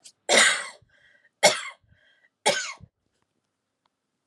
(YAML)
three_cough_length: 4.3 s
three_cough_amplitude: 24930
three_cough_signal_mean_std_ratio: 0.31
survey_phase: alpha (2021-03-01 to 2021-08-12)
age: 18-44
gender: Female
wearing_mask: 'No'
symptom_none: true
smoker_status: Never smoked
respiratory_condition_asthma: false
respiratory_condition_other: false
recruitment_source: Test and Trace
submission_delay: 0 days
covid_test_result: Negative
covid_test_method: LFT